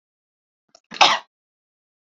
cough_length: 2.1 s
cough_amplitude: 29459
cough_signal_mean_std_ratio: 0.21
survey_phase: beta (2021-08-13 to 2022-03-07)
age: 18-44
gender: Female
wearing_mask: 'No'
symptom_none: true
smoker_status: Never smoked
respiratory_condition_asthma: false
respiratory_condition_other: false
recruitment_source: REACT
submission_delay: 2 days
covid_test_result: Negative
covid_test_method: RT-qPCR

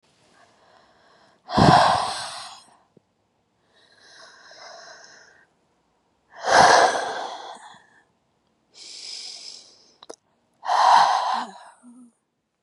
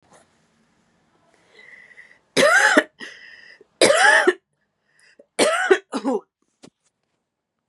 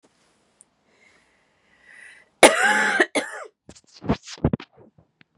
exhalation_length: 12.6 s
exhalation_amplitude: 28345
exhalation_signal_mean_std_ratio: 0.35
three_cough_length: 7.7 s
three_cough_amplitude: 30196
three_cough_signal_mean_std_ratio: 0.37
cough_length: 5.4 s
cough_amplitude: 32768
cough_signal_mean_std_ratio: 0.3
survey_phase: beta (2021-08-13 to 2022-03-07)
age: 18-44
gender: Female
wearing_mask: 'No'
symptom_cough_any: true
symptom_runny_or_blocked_nose: true
symptom_shortness_of_breath: true
symptom_sore_throat: true
symptom_abdominal_pain: true
symptom_diarrhoea: true
symptom_fatigue: true
symptom_headache: true
symptom_change_to_sense_of_smell_or_taste: true
symptom_onset: 3 days
smoker_status: Ex-smoker
respiratory_condition_asthma: false
respiratory_condition_other: false
recruitment_source: Test and Trace
submission_delay: 2 days
covid_test_result: Positive
covid_test_method: RT-qPCR
covid_ct_value: 19.9
covid_ct_gene: ORF1ab gene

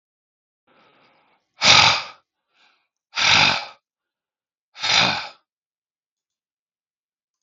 exhalation_length: 7.4 s
exhalation_amplitude: 32768
exhalation_signal_mean_std_ratio: 0.31
survey_phase: beta (2021-08-13 to 2022-03-07)
age: 45-64
gender: Male
wearing_mask: 'No'
symptom_new_continuous_cough: true
symptom_runny_or_blocked_nose: true
symptom_fatigue: true
symptom_change_to_sense_of_smell_or_taste: true
symptom_onset: 3 days
smoker_status: Ex-smoker
respiratory_condition_asthma: false
respiratory_condition_other: false
recruitment_source: Test and Trace
submission_delay: 1 day
covid_test_result: Positive
covid_test_method: RT-qPCR
covid_ct_value: 16.4
covid_ct_gene: ORF1ab gene
covid_ct_mean: 17.6
covid_viral_load: 1700000 copies/ml
covid_viral_load_category: High viral load (>1M copies/ml)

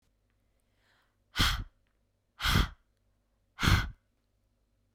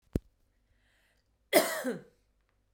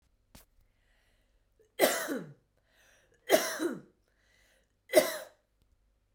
exhalation_length: 4.9 s
exhalation_amplitude: 10371
exhalation_signal_mean_std_ratio: 0.31
cough_length: 2.7 s
cough_amplitude: 12460
cough_signal_mean_std_ratio: 0.27
three_cough_length: 6.1 s
three_cough_amplitude: 12552
three_cough_signal_mean_std_ratio: 0.29
survey_phase: beta (2021-08-13 to 2022-03-07)
age: 18-44
gender: Female
wearing_mask: 'No'
symptom_none: true
smoker_status: Never smoked
respiratory_condition_asthma: false
respiratory_condition_other: false
recruitment_source: REACT
submission_delay: 2 days
covid_test_result: Negative
covid_test_method: RT-qPCR
influenza_a_test_result: Negative
influenza_b_test_result: Negative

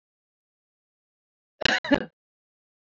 cough_length: 3.0 s
cough_amplitude: 22362
cough_signal_mean_std_ratio: 0.2
survey_phase: alpha (2021-03-01 to 2021-08-12)
age: 45-64
gender: Female
wearing_mask: 'No'
symptom_shortness_of_breath: true
smoker_status: Never smoked
respiratory_condition_asthma: false
respiratory_condition_other: false
recruitment_source: Test and Trace
submission_delay: 1 day
covid_test_result: Positive
covid_test_method: RT-qPCR
covid_ct_value: 24.6
covid_ct_gene: ORF1ab gene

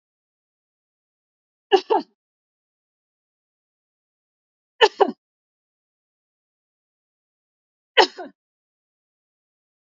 three_cough_length: 9.9 s
three_cough_amplitude: 28849
three_cough_signal_mean_std_ratio: 0.15
survey_phase: beta (2021-08-13 to 2022-03-07)
age: 45-64
gender: Female
wearing_mask: 'No'
symptom_abdominal_pain: true
symptom_fatigue: true
symptom_headache: true
symptom_onset: 8 days
smoker_status: Ex-smoker
respiratory_condition_asthma: false
respiratory_condition_other: false
recruitment_source: REACT
submission_delay: 1 day
covid_test_result: Negative
covid_test_method: RT-qPCR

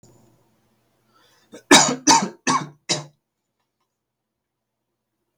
cough_length: 5.4 s
cough_amplitude: 32768
cough_signal_mean_std_ratio: 0.26
survey_phase: beta (2021-08-13 to 2022-03-07)
age: 18-44
gender: Male
wearing_mask: 'No'
symptom_cough_any: true
symptom_new_continuous_cough: true
symptom_runny_or_blocked_nose: true
symptom_sore_throat: true
symptom_fatigue: true
symptom_fever_high_temperature: true
symptom_headache: true
smoker_status: Never smoked
respiratory_condition_asthma: false
respiratory_condition_other: false
recruitment_source: REACT
submission_delay: 3 days
covid_test_result: Negative
covid_test_method: RT-qPCR
influenza_a_test_result: Negative
influenza_b_test_result: Negative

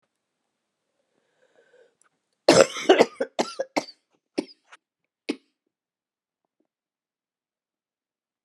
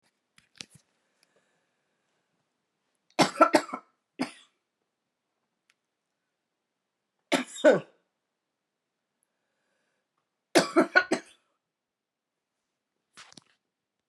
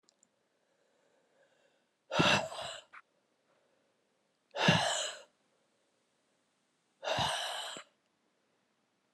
cough_length: 8.4 s
cough_amplitude: 32481
cough_signal_mean_std_ratio: 0.19
three_cough_length: 14.1 s
three_cough_amplitude: 21537
three_cough_signal_mean_std_ratio: 0.2
exhalation_length: 9.1 s
exhalation_amplitude: 7527
exhalation_signal_mean_std_ratio: 0.33
survey_phase: beta (2021-08-13 to 2022-03-07)
age: 45-64
gender: Female
wearing_mask: 'No'
symptom_cough_any: true
symptom_new_continuous_cough: true
symptom_runny_or_blocked_nose: true
symptom_shortness_of_breath: true
symptom_sore_throat: true
symptom_abdominal_pain: true
symptom_fatigue: true
symptom_headache: true
symptom_change_to_sense_of_smell_or_taste: true
symptom_loss_of_taste: true
symptom_other: true
symptom_onset: 3 days
smoker_status: Never smoked
respiratory_condition_asthma: false
respiratory_condition_other: false
recruitment_source: Test and Trace
submission_delay: 1 day
covid_test_result: Positive
covid_test_method: RT-qPCR
covid_ct_value: 15.6
covid_ct_gene: S gene
covid_ct_mean: 16.3
covid_viral_load: 4600000 copies/ml
covid_viral_load_category: High viral load (>1M copies/ml)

